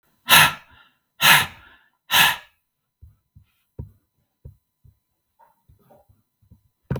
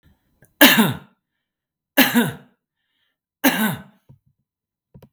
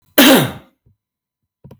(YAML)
exhalation_length: 7.0 s
exhalation_amplitude: 32768
exhalation_signal_mean_std_ratio: 0.26
three_cough_length: 5.1 s
three_cough_amplitude: 32768
three_cough_signal_mean_std_ratio: 0.32
cough_length: 1.8 s
cough_amplitude: 32768
cough_signal_mean_std_ratio: 0.37
survey_phase: beta (2021-08-13 to 2022-03-07)
age: 45-64
gender: Male
wearing_mask: 'No'
symptom_runny_or_blocked_nose: true
smoker_status: Never smoked
respiratory_condition_asthma: false
respiratory_condition_other: false
recruitment_source: REACT
submission_delay: 2 days
covid_test_result: Positive
covid_test_method: RT-qPCR
covid_ct_value: 30.0
covid_ct_gene: E gene
influenza_a_test_result: Negative
influenza_b_test_result: Negative